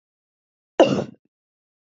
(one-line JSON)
{"cough_length": "2.0 s", "cough_amplitude": 27756, "cough_signal_mean_std_ratio": 0.24, "survey_phase": "beta (2021-08-13 to 2022-03-07)", "age": "18-44", "gender": "Female", "wearing_mask": "No", "symptom_none": true, "smoker_status": "Never smoked", "respiratory_condition_asthma": false, "respiratory_condition_other": false, "recruitment_source": "REACT", "submission_delay": "1 day", "covid_test_result": "Negative", "covid_test_method": "RT-qPCR"}